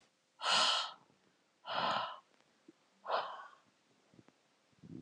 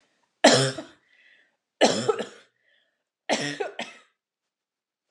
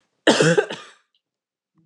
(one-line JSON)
{"exhalation_length": "5.0 s", "exhalation_amplitude": 4347, "exhalation_signal_mean_std_ratio": 0.41, "three_cough_length": "5.1 s", "three_cough_amplitude": 31585, "three_cough_signal_mean_std_ratio": 0.32, "cough_length": "1.9 s", "cough_amplitude": 29007, "cough_signal_mean_std_ratio": 0.36, "survey_phase": "alpha (2021-03-01 to 2021-08-12)", "age": "45-64", "gender": "Female", "wearing_mask": "No", "symptom_cough_any": true, "smoker_status": "Never smoked", "respiratory_condition_asthma": false, "respiratory_condition_other": false, "recruitment_source": "REACT", "submission_delay": "3 days", "covid_test_result": "Negative", "covid_test_method": "RT-qPCR"}